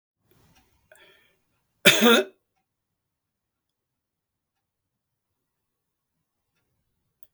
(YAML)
cough_length: 7.3 s
cough_amplitude: 32766
cough_signal_mean_std_ratio: 0.18
survey_phase: beta (2021-08-13 to 2022-03-07)
age: 65+
gender: Male
wearing_mask: 'No'
symptom_fatigue: true
smoker_status: Never smoked
respiratory_condition_asthma: false
respiratory_condition_other: false
recruitment_source: REACT
submission_delay: 3 days
covid_test_result: Negative
covid_test_method: RT-qPCR
influenza_a_test_result: Negative
influenza_b_test_result: Negative